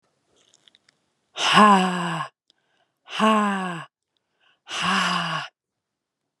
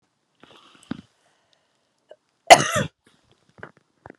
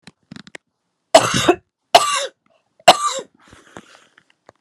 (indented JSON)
{
  "exhalation_length": "6.4 s",
  "exhalation_amplitude": 31322,
  "exhalation_signal_mean_std_ratio": 0.42,
  "cough_length": "4.2 s",
  "cough_amplitude": 32768,
  "cough_signal_mean_std_ratio": 0.16,
  "three_cough_length": "4.6 s",
  "three_cough_amplitude": 32768,
  "three_cough_signal_mean_std_ratio": 0.3,
  "survey_phase": "beta (2021-08-13 to 2022-03-07)",
  "age": "18-44",
  "gender": "Female",
  "wearing_mask": "No",
  "symptom_cough_any": true,
  "symptom_runny_or_blocked_nose": true,
  "symptom_shortness_of_breath": true,
  "symptom_fever_high_temperature": true,
  "symptom_headache": true,
  "symptom_change_to_sense_of_smell_or_taste": true,
  "symptom_onset": "3 days",
  "smoker_status": "Never smoked",
  "respiratory_condition_asthma": false,
  "respiratory_condition_other": false,
  "recruitment_source": "Test and Trace",
  "submission_delay": "2 days",
  "covid_test_result": "Positive",
  "covid_test_method": "RT-qPCR",
  "covid_ct_value": 11.5,
  "covid_ct_gene": "N gene",
  "covid_ct_mean": 12.1,
  "covid_viral_load": "110000000 copies/ml",
  "covid_viral_load_category": "High viral load (>1M copies/ml)"
}